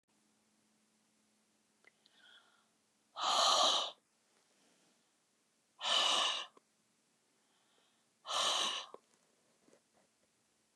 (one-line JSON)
{"exhalation_length": "10.8 s", "exhalation_amplitude": 4364, "exhalation_signal_mean_std_ratio": 0.34, "survey_phase": "beta (2021-08-13 to 2022-03-07)", "age": "65+", "gender": "Female", "wearing_mask": "No", "symptom_none": true, "smoker_status": "Never smoked", "respiratory_condition_asthma": false, "respiratory_condition_other": false, "recruitment_source": "REACT", "submission_delay": "3 days", "covid_test_result": "Negative", "covid_test_method": "RT-qPCR", "influenza_a_test_result": "Negative", "influenza_b_test_result": "Negative"}